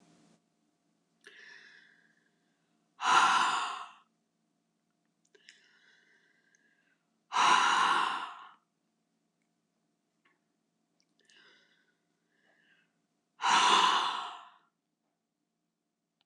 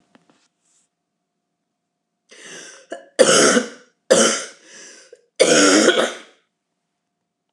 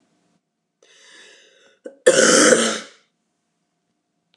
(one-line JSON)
{"exhalation_length": "16.3 s", "exhalation_amplitude": 9137, "exhalation_signal_mean_std_ratio": 0.32, "three_cough_length": "7.5 s", "three_cough_amplitude": 29204, "three_cough_signal_mean_std_ratio": 0.37, "cough_length": "4.4 s", "cough_amplitude": 29204, "cough_signal_mean_std_ratio": 0.32, "survey_phase": "beta (2021-08-13 to 2022-03-07)", "age": "65+", "gender": "Female", "wearing_mask": "No", "symptom_cough_any": true, "symptom_runny_or_blocked_nose": true, "symptom_onset": "5 days", "smoker_status": "Ex-smoker", "respiratory_condition_asthma": false, "respiratory_condition_other": false, "recruitment_source": "Test and Trace", "submission_delay": "1 day", "covid_test_result": "Negative", "covid_test_method": "RT-qPCR"}